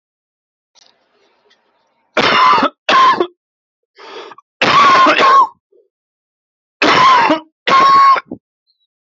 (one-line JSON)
{"three_cough_length": "9.0 s", "three_cough_amplitude": 30791, "three_cough_signal_mean_std_ratio": 0.51, "survey_phase": "alpha (2021-03-01 to 2021-08-12)", "age": "18-44", "gender": "Male", "wearing_mask": "No", "symptom_cough_any": true, "symptom_shortness_of_breath": true, "symptom_diarrhoea": true, "symptom_fatigue": true, "symptom_headache": true, "symptom_change_to_sense_of_smell_or_taste": true, "symptom_loss_of_taste": true, "smoker_status": "Current smoker (e-cigarettes or vapes only)", "respiratory_condition_asthma": false, "respiratory_condition_other": false, "recruitment_source": "Test and Trace", "submission_delay": "1 day", "covid_test_result": "Positive", "covid_test_method": "LFT"}